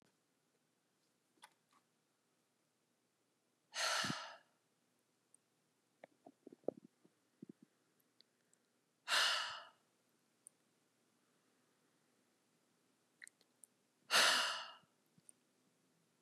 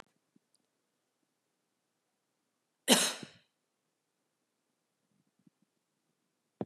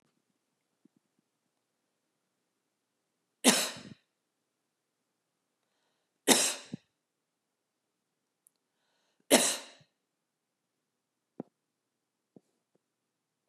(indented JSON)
{
  "exhalation_length": "16.2 s",
  "exhalation_amplitude": 4015,
  "exhalation_signal_mean_std_ratio": 0.24,
  "cough_length": "6.7 s",
  "cough_amplitude": 12015,
  "cough_signal_mean_std_ratio": 0.15,
  "three_cough_length": "13.5 s",
  "three_cough_amplitude": 15770,
  "three_cough_signal_mean_std_ratio": 0.18,
  "survey_phase": "beta (2021-08-13 to 2022-03-07)",
  "age": "45-64",
  "gender": "Female",
  "wearing_mask": "No",
  "symptom_none": true,
  "smoker_status": "Never smoked",
  "respiratory_condition_asthma": false,
  "respiratory_condition_other": false,
  "recruitment_source": "REACT",
  "submission_delay": "2 days",
  "covid_test_result": "Negative",
  "covid_test_method": "RT-qPCR",
  "influenza_a_test_result": "Negative",
  "influenza_b_test_result": "Negative"
}